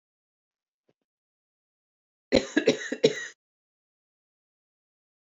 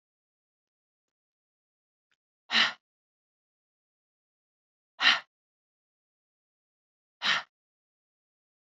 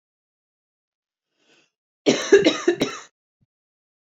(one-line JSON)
{"three_cough_length": "5.3 s", "three_cough_amplitude": 17027, "three_cough_signal_mean_std_ratio": 0.21, "exhalation_length": "8.8 s", "exhalation_amplitude": 13933, "exhalation_signal_mean_std_ratio": 0.19, "cough_length": "4.2 s", "cough_amplitude": 24996, "cough_signal_mean_std_ratio": 0.28, "survey_phase": "beta (2021-08-13 to 2022-03-07)", "age": "45-64", "gender": "Female", "wearing_mask": "No", "symptom_runny_or_blocked_nose": true, "symptom_sore_throat": true, "symptom_diarrhoea": true, "symptom_headache": true, "smoker_status": "Never smoked", "respiratory_condition_asthma": true, "respiratory_condition_other": false, "recruitment_source": "Test and Trace", "submission_delay": "1 day", "covid_test_result": "Positive", "covid_test_method": "RT-qPCR", "covid_ct_value": 32.1, "covid_ct_gene": "ORF1ab gene"}